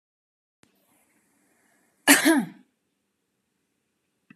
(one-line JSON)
{"cough_length": "4.4 s", "cough_amplitude": 27851, "cough_signal_mean_std_ratio": 0.22, "survey_phase": "beta (2021-08-13 to 2022-03-07)", "age": "18-44", "gender": "Female", "wearing_mask": "No", "symptom_none": true, "smoker_status": "Never smoked", "respiratory_condition_asthma": false, "respiratory_condition_other": false, "recruitment_source": "REACT", "submission_delay": "9 days", "covid_test_result": "Negative", "covid_test_method": "RT-qPCR"}